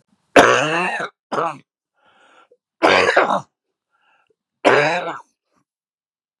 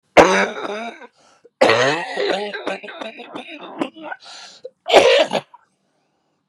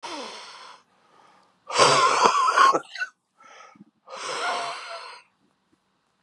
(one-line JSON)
{"three_cough_length": "6.4 s", "three_cough_amplitude": 32768, "three_cough_signal_mean_std_ratio": 0.4, "cough_length": "6.5 s", "cough_amplitude": 32768, "cough_signal_mean_std_ratio": 0.44, "exhalation_length": "6.2 s", "exhalation_amplitude": 30597, "exhalation_signal_mean_std_ratio": 0.44, "survey_phase": "beta (2021-08-13 to 2022-03-07)", "age": "45-64", "gender": "Male", "wearing_mask": "No", "symptom_cough_any": true, "symptom_runny_or_blocked_nose": true, "symptom_abdominal_pain": true, "symptom_fatigue": true, "symptom_headache": true, "symptom_change_to_sense_of_smell_or_taste": true, "symptom_loss_of_taste": true, "symptom_other": true, "symptom_onset": "10 days", "smoker_status": "Ex-smoker", "respiratory_condition_asthma": false, "respiratory_condition_other": true, "recruitment_source": "REACT", "submission_delay": "2 days", "covid_test_result": "Positive", "covid_test_method": "RT-qPCR", "covid_ct_value": 20.0, "covid_ct_gene": "E gene", "influenza_a_test_result": "Negative", "influenza_b_test_result": "Negative"}